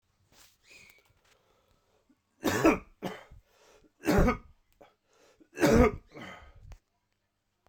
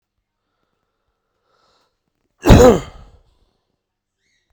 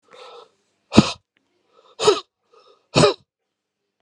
three_cough_length: 7.7 s
three_cough_amplitude: 12053
three_cough_signal_mean_std_ratio: 0.3
cough_length: 4.5 s
cough_amplitude: 32768
cough_signal_mean_std_ratio: 0.22
exhalation_length: 4.0 s
exhalation_amplitude: 32768
exhalation_signal_mean_std_ratio: 0.26
survey_phase: beta (2021-08-13 to 2022-03-07)
age: 45-64
gender: Male
wearing_mask: 'No'
symptom_cough_any: true
symptom_runny_or_blocked_nose: true
symptom_shortness_of_breath: true
symptom_fatigue: true
symptom_headache: true
smoker_status: Never smoked
respiratory_condition_asthma: false
respiratory_condition_other: false
recruitment_source: Test and Trace
submission_delay: 1 day
covid_test_result: Positive
covid_test_method: RT-qPCR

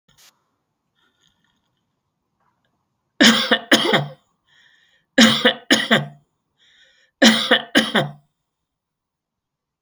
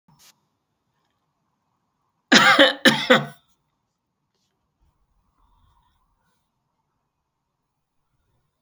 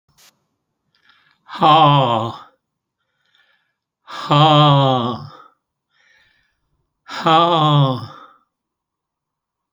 three_cough_length: 9.8 s
three_cough_amplitude: 32768
three_cough_signal_mean_std_ratio: 0.33
cough_length: 8.6 s
cough_amplitude: 32607
cough_signal_mean_std_ratio: 0.22
exhalation_length: 9.7 s
exhalation_amplitude: 32768
exhalation_signal_mean_std_ratio: 0.42
survey_phase: beta (2021-08-13 to 2022-03-07)
age: 65+
gender: Male
wearing_mask: 'No'
symptom_runny_or_blocked_nose: true
symptom_shortness_of_breath: true
smoker_status: Ex-smoker
respiratory_condition_asthma: false
respiratory_condition_other: true
recruitment_source: REACT
submission_delay: 1 day
covid_test_result: Negative
covid_test_method: RT-qPCR
influenza_a_test_result: Negative
influenza_b_test_result: Negative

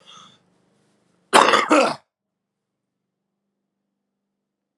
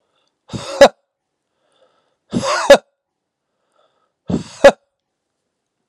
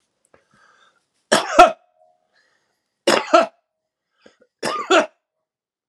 cough_length: 4.8 s
cough_amplitude: 32767
cough_signal_mean_std_ratio: 0.26
exhalation_length: 5.9 s
exhalation_amplitude: 32768
exhalation_signal_mean_std_ratio: 0.23
three_cough_length: 5.9 s
three_cough_amplitude: 32768
three_cough_signal_mean_std_ratio: 0.28
survey_phase: beta (2021-08-13 to 2022-03-07)
age: 45-64
gender: Male
wearing_mask: 'No'
symptom_none: true
symptom_onset: 3 days
smoker_status: Current smoker (11 or more cigarettes per day)
respiratory_condition_asthma: false
respiratory_condition_other: false
recruitment_source: Test and Trace
submission_delay: 2 days
covid_test_result: Positive
covid_test_method: RT-qPCR
covid_ct_value: 18.6
covid_ct_gene: ORF1ab gene
covid_ct_mean: 19.5
covid_viral_load: 410000 copies/ml
covid_viral_load_category: Low viral load (10K-1M copies/ml)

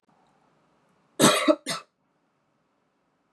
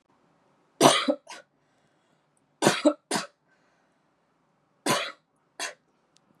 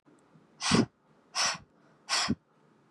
cough_length: 3.3 s
cough_amplitude: 21324
cough_signal_mean_std_ratio: 0.27
three_cough_length: 6.4 s
three_cough_amplitude: 28573
three_cough_signal_mean_std_ratio: 0.28
exhalation_length: 2.9 s
exhalation_amplitude: 7837
exhalation_signal_mean_std_ratio: 0.4
survey_phase: beta (2021-08-13 to 2022-03-07)
age: 18-44
gender: Female
wearing_mask: 'No'
symptom_cough_any: true
symptom_sore_throat: true
symptom_fatigue: true
symptom_headache: true
symptom_other: true
symptom_onset: 3 days
smoker_status: Never smoked
respiratory_condition_asthma: false
respiratory_condition_other: false
recruitment_source: Test and Trace
submission_delay: 2 days
covid_test_result: Positive
covid_test_method: RT-qPCR
covid_ct_value: 18.1
covid_ct_gene: ORF1ab gene
covid_ct_mean: 18.5
covid_viral_load: 840000 copies/ml
covid_viral_load_category: Low viral load (10K-1M copies/ml)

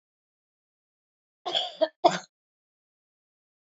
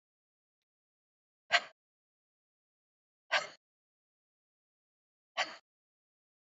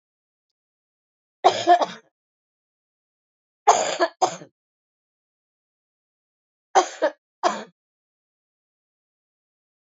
cough_length: 3.7 s
cough_amplitude: 20241
cough_signal_mean_std_ratio: 0.22
exhalation_length: 6.6 s
exhalation_amplitude: 6625
exhalation_signal_mean_std_ratio: 0.16
three_cough_length: 10.0 s
three_cough_amplitude: 25700
three_cough_signal_mean_std_ratio: 0.24
survey_phase: beta (2021-08-13 to 2022-03-07)
age: 65+
gender: Female
wearing_mask: 'No'
symptom_cough_any: true
symptom_runny_or_blocked_nose: true
symptom_sore_throat: true
symptom_fatigue: true
symptom_headache: true
symptom_onset: 5 days
smoker_status: Ex-smoker
respiratory_condition_asthma: true
respiratory_condition_other: false
recruitment_source: Test and Trace
submission_delay: 2 days
covid_test_result: Positive
covid_test_method: RT-qPCR
covid_ct_value: 25.7
covid_ct_gene: N gene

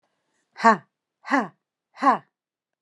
exhalation_length: 2.8 s
exhalation_amplitude: 27196
exhalation_signal_mean_std_ratio: 0.28
survey_phase: beta (2021-08-13 to 2022-03-07)
age: 45-64
gender: Female
wearing_mask: 'No'
symptom_none: true
smoker_status: Never smoked
respiratory_condition_asthma: false
respiratory_condition_other: false
recruitment_source: REACT
submission_delay: 6 days
covid_test_result: Negative
covid_test_method: RT-qPCR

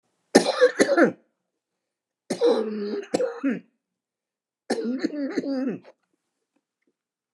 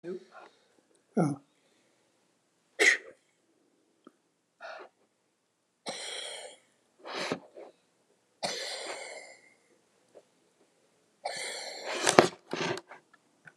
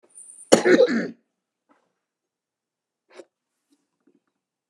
three_cough_length: 7.3 s
three_cough_amplitude: 29204
three_cough_signal_mean_std_ratio: 0.43
exhalation_length: 13.6 s
exhalation_amplitude: 29204
exhalation_signal_mean_std_ratio: 0.29
cough_length: 4.7 s
cough_amplitude: 29204
cough_signal_mean_std_ratio: 0.25
survey_phase: beta (2021-08-13 to 2022-03-07)
age: 65+
gender: Male
wearing_mask: 'No'
symptom_cough_any: true
symptom_runny_or_blocked_nose: true
symptom_shortness_of_breath: true
smoker_status: Ex-smoker
respiratory_condition_asthma: false
respiratory_condition_other: true
recruitment_source: REACT
submission_delay: 2 days
covid_test_result: Negative
covid_test_method: RT-qPCR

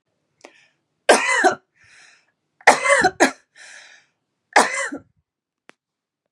three_cough_length: 6.3 s
three_cough_amplitude: 32768
three_cough_signal_mean_std_ratio: 0.33
survey_phase: beta (2021-08-13 to 2022-03-07)
age: 45-64
gender: Female
wearing_mask: 'No'
symptom_cough_any: true
symptom_runny_or_blocked_nose: true
symptom_onset: 12 days
smoker_status: Ex-smoker
respiratory_condition_asthma: false
respiratory_condition_other: false
recruitment_source: REACT
submission_delay: 1 day
covid_test_result: Negative
covid_test_method: RT-qPCR
influenza_a_test_result: Negative
influenza_b_test_result: Negative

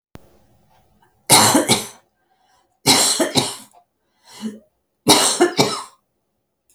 three_cough_length: 6.7 s
three_cough_amplitude: 32768
three_cough_signal_mean_std_ratio: 0.41
survey_phase: alpha (2021-03-01 to 2021-08-12)
age: 65+
gender: Female
wearing_mask: 'No'
symptom_none: true
smoker_status: Ex-smoker
respiratory_condition_asthma: false
respiratory_condition_other: false
recruitment_source: REACT
submission_delay: 1 day
covid_test_result: Negative
covid_test_method: RT-qPCR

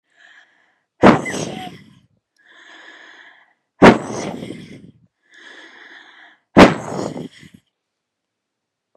exhalation_length: 9.0 s
exhalation_amplitude: 32768
exhalation_signal_mean_std_ratio: 0.25
survey_phase: beta (2021-08-13 to 2022-03-07)
age: 18-44
gender: Female
wearing_mask: 'No'
symptom_sore_throat: true
symptom_fatigue: true
symptom_headache: true
symptom_other: true
smoker_status: Ex-smoker
respiratory_condition_asthma: false
respiratory_condition_other: false
recruitment_source: Test and Trace
submission_delay: 2 days
covid_test_result: Positive
covid_test_method: LFT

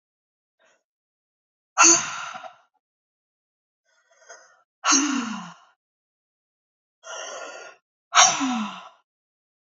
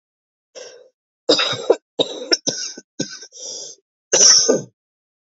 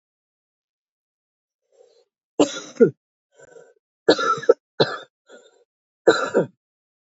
exhalation_length: 9.7 s
exhalation_amplitude: 28381
exhalation_signal_mean_std_ratio: 0.3
cough_length: 5.2 s
cough_amplitude: 32333
cough_signal_mean_std_ratio: 0.39
three_cough_length: 7.2 s
three_cough_amplitude: 27095
three_cough_signal_mean_std_ratio: 0.26
survey_phase: alpha (2021-03-01 to 2021-08-12)
age: 18-44
gender: Female
wearing_mask: 'No'
symptom_cough_any: true
symptom_shortness_of_breath: true
symptom_fatigue: true
symptom_fever_high_temperature: true
symptom_headache: true
symptom_change_to_sense_of_smell_or_taste: true
symptom_loss_of_taste: true
symptom_onset: 4 days
smoker_status: Current smoker (e-cigarettes or vapes only)
respiratory_condition_asthma: false
respiratory_condition_other: false
recruitment_source: Test and Trace
submission_delay: 1 day
covid_test_result: Positive
covid_test_method: RT-qPCR
covid_ct_value: 20.3
covid_ct_gene: ORF1ab gene
covid_ct_mean: 20.8
covid_viral_load: 150000 copies/ml
covid_viral_load_category: Low viral load (10K-1M copies/ml)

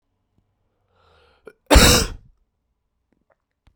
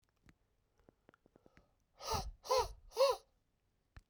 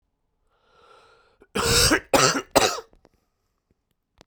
cough_length: 3.8 s
cough_amplitude: 32768
cough_signal_mean_std_ratio: 0.25
exhalation_length: 4.1 s
exhalation_amplitude: 3310
exhalation_signal_mean_std_ratio: 0.32
three_cough_length: 4.3 s
three_cough_amplitude: 31150
three_cough_signal_mean_std_ratio: 0.36
survey_phase: beta (2021-08-13 to 2022-03-07)
age: 18-44
gender: Male
wearing_mask: 'No'
symptom_cough_any: true
symptom_shortness_of_breath: true
symptom_fatigue: true
symptom_fever_high_temperature: true
symptom_headache: true
symptom_change_to_sense_of_smell_or_taste: true
symptom_onset: 3 days
smoker_status: Never smoked
respiratory_condition_asthma: true
respiratory_condition_other: false
recruitment_source: Test and Trace
submission_delay: 2 days
covid_test_result: Positive
covid_test_method: RT-qPCR
covid_ct_value: 13.4
covid_ct_gene: N gene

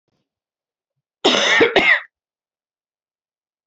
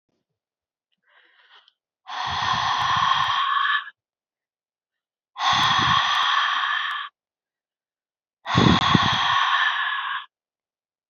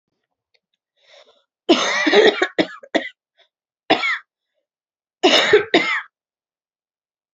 cough_length: 3.7 s
cough_amplitude: 30670
cough_signal_mean_std_ratio: 0.36
exhalation_length: 11.1 s
exhalation_amplitude: 27019
exhalation_signal_mean_std_ratio: 0.59
three_cough_length: 7.3 s
three_cough_amplitude: 32767
three_cough_signal_mean_std_ratio: 0.38
survey_phase: beta (2021-08-13 to 2022-03-07)
age: 18-44
gender: Female
wearing_mask: 'No'
symptom_runny_or_blocked_nose: true
symptom_sore_throat: true
symptom_headache: true
smoker_status: Never smoked
respiratory_condition_asthma: false
respiratory_condition_other: false
recruitment_source: Test and Trace
submission_delay: 2 days
covid_test_result: Positive
covid_test_method: LFT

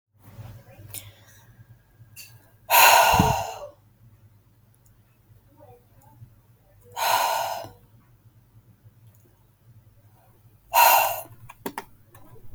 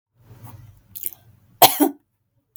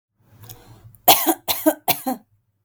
exhalation_length: 12.5 s
exhalation_amplitude: 27857
exhalation_signal_mean_std_ratio: 0.33
cough_length: 2.6 s
cough_amplitude: 32768
cough_signal_mean_std_ratio: 0.24
three_cough_length: 2.6 s
three_cough_amplitude: 32768
three_cough_signal_mean_std_ratio: 0.36
survey_phase: beta (2021-08-13 to 2022-03-07)
age: 18-44
gender: Female
wearing_mask: 'No'
symptom_abdominal_pain: true
smoker_status: Ex-smoker
respiratory_condition_asthma: false
respiratory_condition_other: false
recruitment_source: REACT
submission_delay: 3 days
covid_test_result: Negative
covid_test_method: RT-qPCR
influenza_a_test_result: Negative
influenza_b_test_result: Negative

